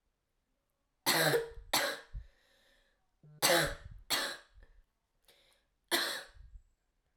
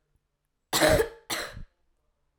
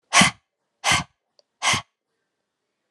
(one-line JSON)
{"three_cough_length": "7.2 s", "three_cough_amplitude": 6472, "three_cough_signal_mean_std_ratio": 0.39, "cough_length": "2.4 s", "cough_amplitude": 14616, "cough_signal_mean_std_ratio": 0.36, "exhalation_length": "2.9 s", "exhalation_amplitude": 27489, "exhalation_signal_mean_std_ratio": 0.32, "survey_phase": "alpha (2021-03-01 to 2021-08-12)", "age": "18-44", "gender": "Female", "wearing_mask": "No", "symptom_cough_any": true, "symptom_shortness_of_breath": true, "symptom_fatigue": true, "smoker_status": "Never smoked", "respiratory_condition_asthma": false, "respiratory_condition_other": false, "recruitment_source": "Test and Trace", "submission_delay": "1 day", "covid_test_result": "Positive", "covid_test_method": "RT-qPCR", "covid_ct_value": 15.1, "covid_ct_gene": "ORF1ab gene", "covid_ct_mean": 15.6, "covid_viral_load": "7600000 copies/ml", "covid_viral_load_category": "High viral load (>1M copies/ml)"}